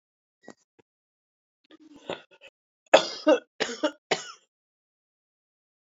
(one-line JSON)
{"cough_length": "5.8 s", "cough_amplitude": 27155, "cough_signal_mean_std_ratio": 0.22, "survey_phase": "beta (2021-08-13 to 2022-03-07)", "age": "45-64", "gender": "Female", "wearing_mask": "No", "symptom_cough_any": true, "symptom_new_continuous_cough": true, "symptom_runny_or_blocked_nose": true, "symptom_shortness_of_breath": true, "symptom_sore_throat": true, "symptom_fatigue": true, "symptom_headache": true, "smoker_status": "Ex-smoker", "respiratory_condition_asthma": false, "respiratory_condition_other": false, "recruitment_source": "Test and Trace", "submission_delay": "2 days", "covid_test_result": "Positive", "covid_test_method": "RT-qPCR", "covid_ct_value": 26.1, "covid_ct_gene": "ORF1ab gene", "covid_ct_mean": 26.5, "covid_viral_load": "2100 copies/ml", "covid_viral_load_category": "Minimal viral load (< 10K copies/ml)"}